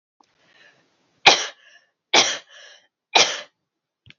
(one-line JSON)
{"three_cough_length": "4.2 s", "three_cough_amplitude": 32767, "three_cough_signal_mean_std_ratio": 0.27, "survey_phase": "alpha (2021-03-01 to 2021-08-12)", "age": "18-44", "gender": "Female", "wearing_mask": "No", "symptom_none": true, "smoker_status": "Never smoked", "respiratory_condition_asthma": false, "respiratory_condition_other": false, "recruitment_source": "REACT", "submission_delay": "1 day", "covid_test_result": "Negative", "covid_test_method": "RT-qPCR"}